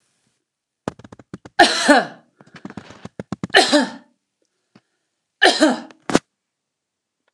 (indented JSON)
{
  "three_cough_length": "7.3 s",
  "three_cough_amplitude": 29204,
  "three_cough_signal_mean_std_ratio": 0.31,
  "survey_phase": "alpha (2021-03-01 to 2021-08-12)",
  "age": "65+",
  "gender": "Female",
  "wearing_mask": "No",
  "symptom_none": true,
  "smoker_status": "Never smoked",
  "respiratory_condition_asthma": false,
  "respiratory_condition_other": false,
  "recruitment_source": "REACT",
  "submission_delay": "1 day",
  "covid_test_result": "Negative",
  "covid_test_method": "RT-qPCR"
}